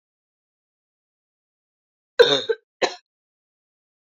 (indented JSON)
{
  "cough_length": "4.0 s",
  "cough_amplitude": 27852,
  "cough_signal_mean_std_ratio": 0.2,
  "survey_phase": "alpha (2021-03-01 to 2021-08-12)",
  "age": "18-44",
  "gender": "Female",
  "wearing_mask": "No",
  "symptom_cough_any": true,
  "symptom_headache": true,
  "smoker_status": "Never smoked",
  "respiratory_condition_asthma": false,
  "respiratory_condition_other": false,
  "recruitment_source": "Test and Trace",
  "submission_delay": "2 days",
  "covid_test_result": "Positive",
  "covid_test_method": "RT-qPCR"
}